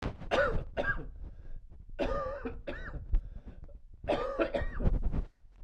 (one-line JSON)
{"three_cough_length": "5.6 s", "three_cough_amplitude": 5983, "three_cough_signal_mean_std_ratio": 0.72, "survey_phase": "beta (2021-08-13 to 2022-03-07)", "age": "45-64", "gender": "Male", "wearing_mask": "No", "symptom_cough_any": true, "symptom_new_continuous_cough": true, "symptom_runny_or_blocked_nose": true, "symptom_fatigue": true, "smoker_status": "Ex-smoker", "respiratory_condition_asthma": false, "respiratory_condition_other": false, "recruitment_source": "Test and Trace", "submission_delay": "2 days", "covid_test_result": "Positive", "covid_test_method": "RT-qPCR"}